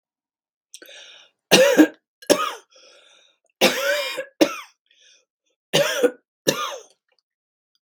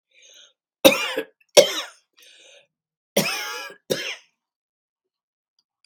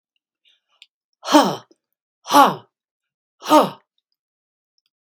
{"three_cough_length": "7.9 s", "three_cough_amplitude": 32768, "three_cough_signal_mean_std_ratio": 0.35, "cough_length": "5.9 s", "cough_amplitude": 32767, "cough_signal_mean_std_ratio": 0.26, "exhalation_length": "5.0 s", "exhalation_amplitude": 32768, "exhalation_signal_mean_std_ratio": 0.27, "survey_phase": "beta (2021-08-13 to 2022-03-07)", "age": "65+", "gender": "Female", "wearing_mask": "No", "symptom_none": true, "smoker_status": "Ex-smoker", "respiratory_condition_asthma": false, "respiratory_condition_other": false, "recruitment_source": "REACT", "submission_delay": "1 day", "covid_test_result": "Negative", "covid_test_method": "RT-qPCR"}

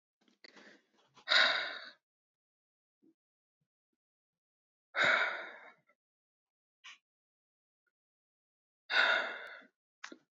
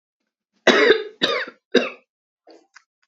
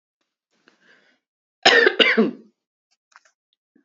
{"exhalation_length": "10.3 s", "exhalation_amplitude": 7393, "exhalation_signal_mean_std_ratio": 0.29, "three_cough_length": "3.1 s", "three_cough_amplitude": 31919, "three_cough_signal_mean_std_ratio": 0.36, "cough_length": "3.8 s", "cough_amplitude": 29588, "cough_signal_mean_std_ratio": 0.3, "survey_phase": "beta (2021-08-13 to 2022-03-07)", "age": "18-44", "gender": "Female", "wearing_mask": "No", "symptom_headache": true, "smoker_status": "Ex-smoker", "respiratory_condition_asthma": false, "respiratory_condition_other": false, "recruitment_source": "REACT", "submission_delay": "3 days", "covid_test_result": "Negative", "covid_test_method": "RT-qPCR", "influenza_a_test_result": "Negative", "influenza_b_test_result": "Negative"}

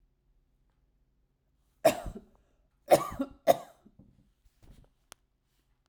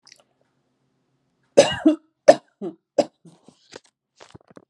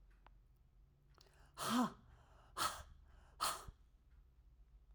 {"cough_length": "5.9 s", "cough_amplitude": 15196, "cough_signal_mean_std_ratio": 0.2, "three_cough_length": "4.7 s", "three_cough_amplitude": 32768, "three_cough_signal_mean_std_ratio": 0.21, "exhalation_length": "4.9 s", "exhalation_amplitude": 1809, "exhalation_signal_mean_std_ratio": 0.38, "survey_phase": "alpha (2021-03-01 to 2021-08-12)", "age": "45-64", "gender": "Female", "wearing_mask": "No", "symptom_none": true, "symptom_cough_any": true, "smoker_status": "Never smoked", "respiratory_condition_asthma": false, "respiratory_condition_other": false, "recruitment_source": "REACT", "submission_delay": "2 days", "covid_test_result": "Negative", "covid_test_method": "RT-qPCR"}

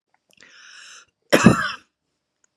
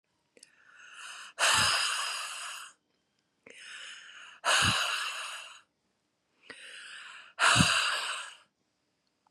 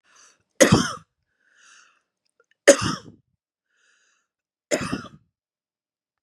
{"cough_length": "2.6 s", "cough_amplitude": 32768, "cough_signal_mean_std_ratio": 0.27, "exhalation_length": "9.3 s", "exhalation_amplitude": 12547, "exhalation_signal_mean_std_ratio": 0.47, "three_cough_length": "6.2 s", "three_cough_amplitude": 32767, "three_cough_signal_mean_std_ratio": 0.23, "survey_phase": "beta (2021-08-13 to 2022-03-07)", "age": "45-64", "gender": "Female", "wearing_mask": "No", "symptom_none": true, "smoker_status": "Ex-smoker", "respiratory_condition_asthma": false, "respiratory_condition_other": false, "recruitment_source": "REACT", "submission_delay": "2 days", "covid_test_result": "Negative", "covid_test_method": "RT-qPCR", "influenza_a_test_result": "Negative", "influenza_b_test_result": "Negative"}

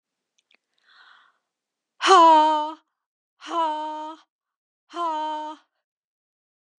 {"exhalation_length": "6.8 s", "exhalation_amplitude": 27474, "exhalation_signal_mean_std_ratio": 0.35, "survey_phase": "beta (2021-08-13 to 2022-03-07)", "age": "45-64", "gender": "Female", "wearing_mask": "No", "symptom_runny_or_blocked_nose": true, "symptom_sore_throat": true, "smoker_status": "Ex-smoker", "respiratory_condition_asthma": false, "respiratory_condition_other": false, "recruitment_source": "Test and Trace", "submission_delay": "0 days", "covid_test_result": "Positive", "covid_test_method": "LFT"}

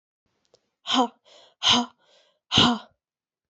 {"exhalation_length": "3.5 s", "exhalation_amplitude": 21677, "exhalation_signal_mean_std_ratio": 0.35, "survey_phase": "beta (2021-08-13 to 2022-03-07)", "age": "18-44", "gender": "Female", "wearing_mask": "No", "symptom_cough_any": true, "symptom_runny_or_blocked_nose": true, "symptom_shortness_of_breath": true, "symptom_headache": true, "symptom_change_to_sense_of_smell_or_taste": true, "symptom_loss_of_taste": true, "symptom_other": true, "smoker_status": "Never smoked", "respiratory_condition_asthma": false, "respiratory_condition_other": false, "recruitment_source": "Test and Trace", "submission_delay": "1 day", "covid_test_result": "Positive", "covid_test_method": "ePCR"}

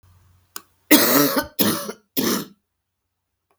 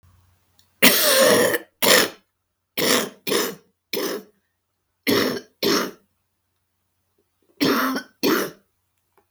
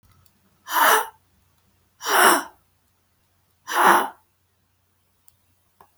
{"three_cough_length": "3.6 s", "three_cough_amplitude": 32768, "three_cough_signal_mean_std_ratio": 0.42, "cough_length": "9.3 s", "cough_amplitude": 32768, "cough_signal_mean_std_ratio": 0.46, "exhalation_length": "6.0 s", "exhalation_amplitude": 32246, "exhalation_signal_mean_std_ratio": 0.34, "survey_phase": "beta (2021-08-13 to 2022-03-07)", "age": "65+", "gender": "Female", "wearing_mask": "No", "symptom_new_continuous_cough": true, "symptom_sore_throat": true, "symptom_fatigue": true, "smoker_status": "Never smoked", "respiratory_condition_asthma": false, "respiratory_condition_other": false, "recruitment_source": "Test and Trace", "submission_delay": "2 days", "covid_test_result": "Positive", "covid_test_method": "LFT"}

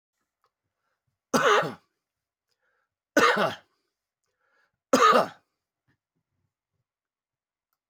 {"three_cough_length": "7.9 s", "three_cough_amplitude": 14747, "three_cough_signal_mean_std_ratio": 0.28, "survey_phase": "alpha (2021-03-01 to 2021-08-12)", "age": "65+", "gender": "Male", "wearing_mask": "No", "symptom_cough_any": true, "symptom_fatigue": true, "symptom_change_to_sense_of_smell_or_taste": true, "symptom_onset": "2 days", "smoker_status": "Ex-smoker", "respiratory_condition_asthma": false, "respiratory_condition_other": false, "recruitment_source": "Test and Trace", "submission_delay": "2 days", "covid_test_result": "Positive", "covid_test_method": "RT-qPCR"}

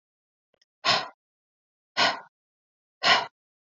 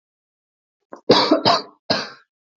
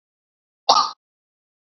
{"exhalation_length": "3.7 s", "exhalation_amplitude": 16613, "exhalation_signal_mean_std_ratio": 0.31, "three_cough_length": "2.6 s", "three_cough_amplitude": 28776, "three_cough_signal_mean_std_ratio": 0.38, "cough_length": "1.6 s", "cough_amplitude": 29334, "cough_signal_mean_std_ratio": 0.25, "survey_phase": "beta (2021-08-13 to 2022-03-07)", "age": "18-44", "gender": "Female", "wearing_mask": "No", "symptom_none": true, "smoker_status": "Never smoked", "respiratory_condition_asthma": true, "respiratory_condition_other": false, "recruitment_source": "REACT", "submission_delay": "1 day", "covid_test_result": "Negative", "covid_test_method": "RT-qPCR"}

